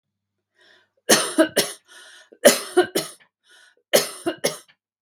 {"three_cough_length": "5.0 s", "three_cough_amplitude": 32768, "three_cough_signal_mean_std_ratio": 0.34, "survey_phase": "beta (2021-08-13 to 2022-03-07)", "age": "45-64", "gender": "Female", "wearing_mask": "No", "symptom_none": true, "smoker_status": "Ex-smoker", "respiratory_condition_asthma": false, "respiratory_condition_other": false, "recruitment_source": "REACT", "submission_delay": "2 days", "covid_test_result": "Negative", "covid_test_method": "RT-qPCR", "influenza_a_test_result": "Unknown/Void", "influenza_b_test_result": "Unknown/Void"}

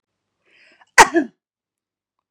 {"cough_length": "2.3 s", "cough_amplitude": 32768, "cough_signal_mean_std_ratio": 0.2, "survey_phase": "beta (2021-08-13 to 2022-03-07)", "age": "45-64", "gender": "Female", "wearing_mask": "No", "symptom_none": true, "smoker_status": "Never smoked", "respiratory_condition_asthma": false, "respiratory_condition_other": false, "recruitment_source": "REACT", "submission_delay": "2 days", "covid_test_result": "Negative", "covid_test_method": "RT-qPCR", "influenza_a_test_result": "Negative", "influenza_b_test_result": "Negative"}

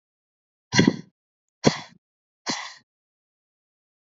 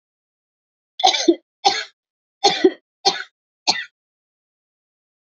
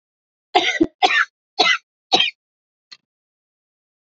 {"exhalation_length": "4.0 s", "exhalation_amplitude": 27414, "exhalation_signal_mean_std_ratio": 0.23, "three_cough_length": "5.3 s", "three_cough_amplitude": 29534, "three_cough_signal_mean_std_ratio": 0.3, "cough_length": "4.2 s", "cough_amplitude": 30289, "cough_signal_mean_std_ratio": 0.35, "survey_phase": "beta (2021-08-13 to 2022-03-07)", "age": "45-64", "gender": "Female", "wearing_mask": "No", "symptom_runny_or_blocked_nose": true, "symptom_shortness_of_breath": true, "symptom_sore_throat": true, "symptom_fatigue": true, "symptom_headache": true, "symptom_onset": "8 days", "smoker_status": "Ex-smoker", "respiratory_condition_asthma": true, "respiratory_condition_other": false, "recruitment_source": "REACT", "submission_delay": "2 days", "covid_test_result": "Positive", "covid_test_method": "RT-qPCR", "covid_ct_value": 21.0, "covid_ct_gene": "E gene", "influenza_a_test_result": "Negative", "influenza_b_test_result": "Negative"}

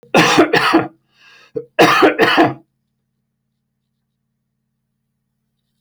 {"cough_length": "5.8 s", "cough_amplitude": 30796, "cough_signal_mean_std_ratio": 0.4, "survey_phase": "alpha (2021-03-01 to 2021-08-12)", "age": "45-64", "gender": "Male", "wearing_mask": "No", "symptom_cough_any": true, "smoker_status": "Ex-smoker", "respiratory_condition_asthma": false, "respiratory_condition_other": false, "recruitment_source": "REACT", "submission_delay": "1 day", "covid_test_result": "Negative", "covid_test_method": "RT-qPCR"}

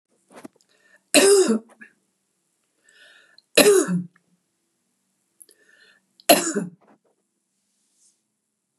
{"three_cough_length": "8.8 s", "three_cough_amplitude": 32373, "three_cough_signal_mean_std_ratio": 0.29, "survey_phase": "beta (2021-08-13 to 2022-03-07)", "age": "65+", "gender": "Female", "wearing_mask": "No", "symptom_none": true, "smoker_status": "Never smoked", "respiratory_condition_asthma": false, "respiratory_condition_other": false, "recruitment_source": "REACT", "submission_delay": "3 days", "covid_test_result": "Negative", "covid_test_method": "RT-qPCR", "influenza_a_test_result": "Negative", "influenza_b_test_result": "Negative"}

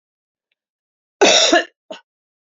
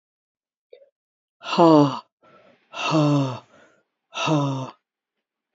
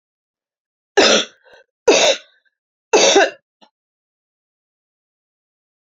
{"cough_length": "2.6 s", "cough_amplitude": 32768, "cough_signal_mean_std_ratio": 0.33, "exhalation_length": "5.5 s", "exhalation_amplitude": 25717, "exhalation_signal_mean_std_ratio": 0.4, "three_cough_length": "5.9 s", "three_cough_amplitude": 32768, "three_cough_signal_mean_std_ratio": 0.32, "survey_phase": "beta (2021-08-13 to 2022-03-07)", "age": "45-64", "gender": "Female", "wearing_mask": "No", "symptom_cough_any": true, "symptom_runny_or_blocked_nose": true, "symptom_fatigue": true, "symptom_onset": "5 days", "smoker_status": "Never smoked", "respiratory_condition_asthma": false, "respiratory_condition_other": false, "recruitment_source": "Test and Trace", "submission_delay": "2 days", "covid_test_result": "Positive", "covid_test_method": "ePCR"}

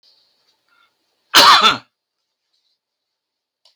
{"cough_length": "3.8 s", "cough_amplitude": 32768, "cough_signal_mean_std_ratio": 0.27, "survey_phase": "beta (2021-08-13 to 2022-03-07)", "age": "65+", "gender": "Male", "wearing_mask": "No", "symptom_none": true, "smoker_status": "Ex-smoker", "respiratory_condition_asthma": false, "respiratory_condition_other": false, "recruitment_source": "REACT", "submission_delay": "3 days", "covid_test_result": "Negative", "covid_test_method": "RT-qPCR", "influenza_a_test_result": "Unknown/Void", "influenza_b_test_result": "Unknown/Void"}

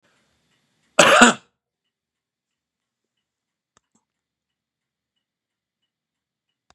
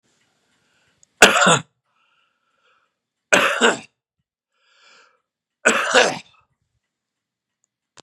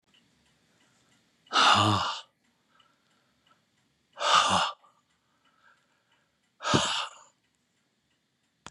{"cough_length": "6.7 s", "cough_amplitude": 32768, "cough_signal_mean_std_ratio": 0.17, "three_cough_length": "8.0 s", "three_cough_amplitude": 32768, "three_cough_signal_mean_std_ratio": 0.29, "exhalation_length": "8.7 s", "exhalation_amplitude": 14517, "exhalation_signal_mean_std_ratio": 0.33, "survey_phase": "beta (2021-08-13 to 2022-03-07)", "age": "65+", "gender": "Male", "wearing_mask": "No", "symptom_cough_any": true, "symptom_shortness_of_breath": true, "symptom_onset": "12 days", "smoker_status": "Ex-smoker", "respiratory_condition_asthma": false, "respiratory_condition_other": false, "recruitment_source": "REACT", "submission_delay": "1 day", "covid_test_result": "Negative", "covid_test_method": "RT-qPCR", "influenza_a_test_result": "Negative", "influenza_b_test_result": "Negative"}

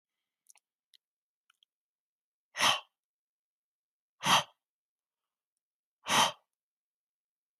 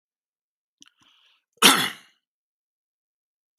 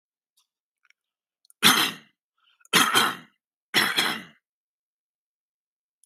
{"exhalation_length": "7.6 s", "exhalation_amplitude": 8545, "exhalation_signal_mean_std_ratio": 0.22, "cough_length": "3.6 s", "cough_amplitude": 32137, "cough_signal_mean_std_ratio": 0.19, "three_cough_length": "6.1 s", "three_cough_amplitude": 25312, "three_cough_signal_mean_std_ratio": 0.32, "survey_phase": "beta (2021-08-13 to 2022-03-07)", "age": "18-44", "gender": "Male", "wearing_mask": "No", "symptom_none": true, "smoker_status": "Never smoked", "respiratory_condition_asthma": false, "respiratory_condition_other": false, "recruitment_source": "REACT", "submission_delay": "1 day", "covid_test_result": "Negative", "covid_test_method": "RT-qPCR", "influenza_a_test_result": "Unknown/Void", "influenza_b_test_result": "Unknown/Void"}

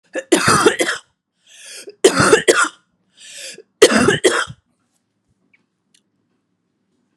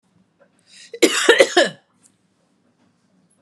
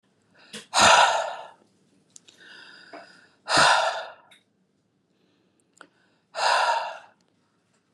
{"three_cough_length": "7.2 s", "three_cough_amplitude": 32768, "three_cough_signal_mean_std_ratio": 0.39, "cough_length": "3.4 s", "cough_amplitude": 32768, "cough_signal_mean_std_ratio": 0.3, "exhalation_length": "7.9 s", "exhalation_amplitude": 23568, "exhalation_signal_mean_std_ratio": 0.37, "survey_phase": "beta (2021-08-13 to 2022-03-07)", "age": "18-44", "gender": "Female", "wearing_mask": "No", "symptom_fatigue": true, "smoker_status": "Ex-smoker", "respiratory_condition_asthma": false, "respiratory_condition_other": false, "recruitment_source": "Test and Trace", "submission_delay": "1 day", "covid_test_result": "Positive", "covid_test_method": "LAMP"}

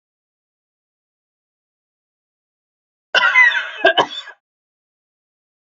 {"cough_length": "5.7 s", "cough_amplitude": 28880, "cough_signal_mean_std_ratio": 0.28, "survey_phase": "beta (2021-08-13 to 2022-03-07)", "age": "45-64", "gender": "Female", "wearing_mask": "No", "symptom_sore_throat": true, "symptom_fatigue": true, "symptom_headache": true, "symptom_onset": "3 days", "smoker_status": "Never smoked", "respiratory_condition_asthma": false, "respiratory_condition_other": false, "recruitment_source": "Test and Trace", "submission_delay": "1 day", "covid_test_result": "Positive", "covid_test_method": "RT-qPCR", "covid_ct_value": 22.4, "covid_ct_gene": "ORF1ab gene", "covid_ct_mean": 23.5, "covid_viral_load": "19000 copies/ml", "covid_viral_load_category": "Low viral load (10K-1M copies/ml)"}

